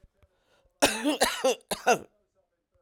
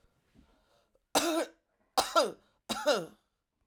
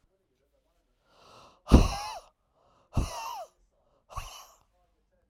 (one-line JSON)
{"cough_length": "2.8 s", "cough_amplitude": 20576, "cough_signal_mean_std_ratio": 0.4, "three_cough_length": "3.7 s", "three_cough_amplitude": 9332, "three_cough_signal_mean_std_ratio": 0.38, "exhalation_length": "5.3 s", "exhalation_amplitude": 23427, "exhalation_signal_mean_std_ratio": 0.23, "survey_phase": "beta (2021-08-13 to 2022-03-07)", "age": "45-64", "gender": "Female", "wearing_mask": "No", "symptom_cough_any": true, "symptom_runny_or_blocked_nose": true, "symptom_fatigue": true, "symptom_onset": "3 days", "smoker_status": "Ex-smoker", "respiratory_condition_asthma": false, "respiratory_condition_other": false, "recruitment_source": "REACT", "submission_delay": "1 day", "covid_test_result": "Positive", "covid_test_method": "RT-qPCR", "covid_ct_value": 22.9, "covid_ct_gene": "E gene", "influenza_a_test_result": "Negative", "influenza_b_test_result": "Negative"}